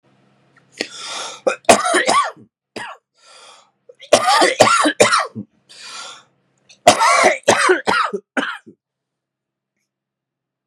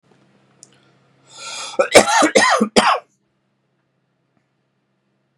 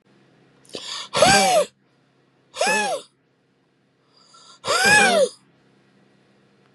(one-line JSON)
{"three_cough_length": "10.7 s", "three_cough_amplitude": 32768, "three_cough_signal_mean_std_ratio": 0.43, "cough_length": "5.4 s", "cough_amplitude": 32768, "cough_signal_mean_std_ratio": 0.34, "exhalation_length": "6.7 s", "exhalation_amplitude": 25966, "exhalation_signal_mean_std_ratio": 0.41, "survey_phase": "beta (2021-08-13 to 2022-03-07)", "age": "18-44", "gender": "Male", "wearing_mask": "No", "symptom_none": true, "symptom_onset": "8 days", "smoker_status": "Never smoked", "respiratory_condition_asthma": false, "respiratory_condition_other": false, "recruitment_source": "REACT", "submission_delay": "3 days", "covid_test_result": "Negative", "covid_test_method": "RT-qPCR", "influenza_a_test_result": "Negative", "influenza_b_test_result": "Negative"}